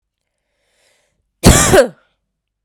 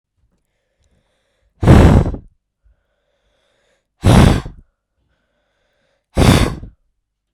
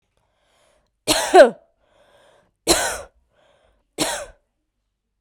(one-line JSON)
{"cough_length": "2.6 s", "cough_amplitude": 32768, "cough_signal_mean_std_ratio": 0.32, "exhalation_length": "7.3 s", "exhalation_amplitude": 32768, "exhalation_signal_mean_std_ratio": 0.33, "three_cough_length": "5.2 s", "three_cough_amplitude": 32768, "three_cough_signal_mean_std_ratio": 0.26, "survey_phase": "beta (2021-08-13 to 2022-03-07)", "age": "18-44", "gender": "Female", "wearing_mask": "No", "symptom_runny_or_blocked_nose": true, "symptom_change_to_sense_of_smell_or_taste": true, "symptom_loss_of_taste": true, "symptom_onset": "3 days", "smoker_status": "Never smoked", "respiratory_condition_asthma": false, "respiratory_condition_other": false, "recruitment_source": "Test and Trace", "submission_delay": "2 days", "covid_test_result": "Positive", "covid_test_method": "RT-qPCR", "covid_ct_value": 15.0, "covid_ct_gene": "ORF1ab gene", "covid_ct_mean": 15.1, "covid_viral_load": "11000000 copies/ml", "covid_viral_load_category": "High viral load (>1M copies/ml)"}